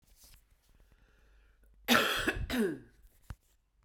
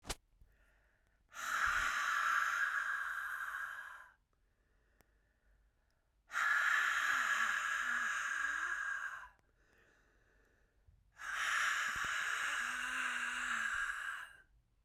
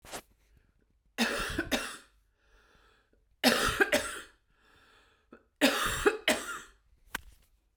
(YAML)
cough_length: 3.8 s
cough_amplitude: 10904
cough_signal_mean_std_ratio: 0.38
exhalation_length: 14.8 s
exhalation_amplitude: 2707
exhalation_signal_mean_std_ratio: 0.71
three_cough_length: 7.8 s
three_cough_amplitude: 14496
three_cough_signal_mean_std_ratio: 0.4
survey_phase: beta (2021-08-13 to 2022-03-07)
age: 18-44
gender: Female
wearing_mask: 'No'
symptom_runny_or_blocked_nose: true
symptom_fatigue: true
symptom_onset: 3 days
smoker_status: Ex-smoker
respiratory_condition_asthma: false
respiratory_condition_other: false
recruitment_source: Test and Trace
submission_delay: 2 days
covid_test_result: Positive
covid_test_method: RT-qPCR
covid_ct_value: 18.3
covid_ct_gene: N gene
covid_ct_mean: 18.9
covid_viral_load: 620000 copies/ml
covid_viral_load_category: Low viral load (10K-1M copies/ml)